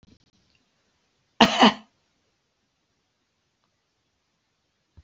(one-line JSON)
{"cough_length": "5.0 s", "cough_amplitude": 32768, "cough_signal_mean_std_ratio": 0.18, "survey_phase": "beta (2021-08-13 to 2022-03-07)", "age": "65+", "gender": "Male", "wearing_mask": "No", "symptom_none": true, "smoker_status": "Ex-smoker", "respiratory_condition_asthma": false, "respiratory_condition_other": false, "recruitment_source": "REACT", "submission_delay": "1 day", "covid_test_result": "Negative", "covid_test_method": "RT-qPCR", "influenza_a_test_result": "Negative", "influenza_b_test_result": "Negative"}